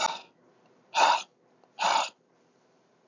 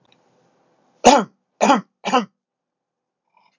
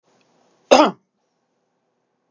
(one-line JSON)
{"exhalation_length": "3.1 s", "exhalation_amplitude": 12132, "exhalation_signal_mean_std_ratio": 0.38, "three_cough_length": "3.6 s", "three_cough_amplitude": 32768, "three_cough_signal_mean_std_ratio": 0.28, "cough_length": "2.3 s", "cough_amplitude": 32768, "cough_signal_mean_std_ratio": 0.21, "survey_phase": "beta (2021-08-13 to 2022-03-07)", "age": "45-64", "gender": "Male", "wearing_mask": "No", "symptom_none": true, "smoker_status": "Never smoked", "respiratory_condition_asthma": false, "respiratory_condition_other": false, "recruitment_source": "REACT", "submission_delay": "2 days", "covid_test_result": "Negative", "covid_test_method": "RT-qPCR", "influenza_a_test_result": "Negative", "influenza_b_test_result": "Negative"}